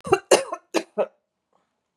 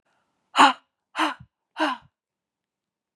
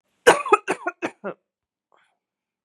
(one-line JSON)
{"three_cough_length": "2.0 s", "three_cough_amplitude": 27871, "three_cough_signal_mean_std_ratio": 0.31, "exhalation_length": "3.2 s", "exhalation_amplitude": 24636, "exhalation_signal_mean_std_ratio": 0.27, "cough_length": "2.6 s", "cough_amplitude": 32768, "cough_signal_mean_std_ratio": 0.26, "survey_phase": "beta (2021-08-13 to 2022-03-07)", "age": "18-44", "gender": "Female", "wearing_mask": "No", "symptom_cough_any": true, "symptom_runny_or_blocked_nose": true, "symptom_sore_throat": true, "symptom_diarrhoea": true, "symptom_fatigue": true, "symptom_headache": true, "smoker_status": "Never smoked", "respiratory_condition_asthma": false, "respiratory_condition_other": false, "recruitment_source": "Test and Trace", "submission_delay": "2 days", "covid_test_result": "Positive", "covid_test_method": "RT-qPCR"}